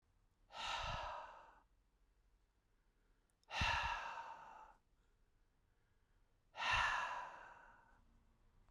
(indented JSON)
{
  "exhalation_length": "8.7 s",
  "exhalation_amplitude": 1861,
  "exhalation_signal_mean_std_ratio": 0.44,
  "survey_phase": "beta (2021-08-13 to 2022-03-07)",
  "age": "45-64",
  "gender": "Male",
  "wearing_mask": "No",
  "symptom_none": true,
  "smoker_status": "Never smoked",
  "respiratory_condition_asthma": false,
  "respiratory_condition_other": false,
  "recruitment_source": "REACT",
  "submission_delay": "1 day",
  "covid_test_result": "Negative",
  "covid_test_method": "RT-qPCR"
}